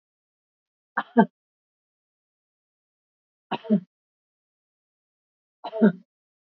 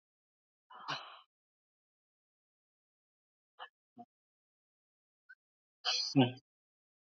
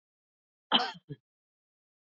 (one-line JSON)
{"three_cough_length": "6.5 s", "three_cough_amplitude": 23958, "three_cough_signal_mean_std_ratio": 0.19, "exhalation_length": "7.2 s", "exhalation_amplitude": 5106, "exhalation_signal_mean_std_ratio": 0.2, "cough_length": "2.0 s", "cough_amplitude": 12369, "cough_signal_mean_std_ratio": 0.22, "survey_phase": "beta (2021-08-13 to 2022-03-07)", "age": "65+", "gender": "Female", "wearing_mask": "No", "symptom_none": true, "smoker_status": "Never smoked", "respiratory_condition_asthma": true, "respiratory_condition_other": false, "recruitment_source": "REACT", "submission_delay": "1 day", "covid_test_result": "Negative", "covid_test_method": "RT-qPCR", "influenza_a_test_result": "Unknown/Void", "influenza_b_test_result": "Unknown/Void"}